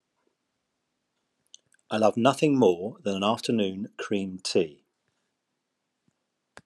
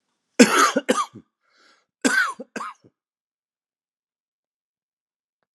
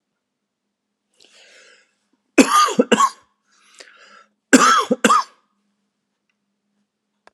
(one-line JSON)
{"exhalation_length": "6.7 s", "exhalation_amplitude": 16101, "exhalation_signal_mean_std_ratio": 0.41, "cough_length": "5.5 s", "cough_amplitude": 32761, "cough_signal_mean_std_ratio": 0.28, "three_cough_length": "7.3 s", "three_cough_amplitude": 32768, "three_cough_signal_mean_std_ratio": 0.3, "survey_phase": "alpha (2021-03-01 to 2021-08-12)", "age": "45-64", "gender": "Male", "wearing_mask": "No", "symptom_none": true, "smoker_status": "Never smoked", "respiratory_condition_asthma": false, "respiratory_condition_other": false, "recruitment_source": "Test and Trace", "submission_delay": "0 days", "covid_test_result": "Negative", "covid_test_method": "LFT"}